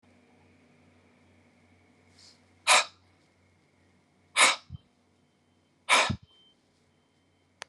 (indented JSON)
{
  "exhalation_length": "7.7 s",
  "exhalation_amplitude": 16534,
  "exhalation_signal_mean_std_ratio": 0.23,
  "survey_phase": "beta (2021-08-13 to 2022-03-07)",
  "age": "45-64",
  "gender": "Male",
  "wearing_mask": "No",
  "symptom_none": true,
  "smoker_status": "Current smoker (1 to 10 cigarettes per day)",
  "respiratory_condition_asthma": false,
  "respiratory_condition_other": false,
  "recruitment_source": "REACT",
  "submission_delay": "9 days",
  "covid_test_result": "Negative",
  "covid_test_method": "RT-qPCR"
}